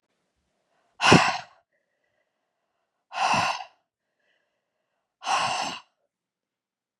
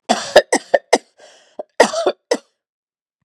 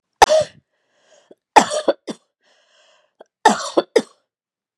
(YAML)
exhalation_length: 7.0 s
exhalation_amplitude: 32029
exhalation_signal_mean_std_ratio: 0.3
cough_length: 3.2 s
cough_amplitude: 32768
cough_signal_mean_std_ratio: 0.32
three_cough_length: 4.8 s
three_cough_amplitude: 32768
three_cough_signal_mean_std_ratio: 0.28
survey_phase: beta (2021-08-13 to 2022-03-07)
age: 45-64
gender: Female
wearing_mask: 'No'
symptom_none: true
smoker_status: Never smoked
respiratory_condition_asthma: false
respiratory_condition_other: false
recruitment_source: REACT
submission_delay: 2 days
covid_test_result: Negative
covid_test_method: RT-qPCR
influenza_a_test_result: Negative
influenza_b_test_result: Negative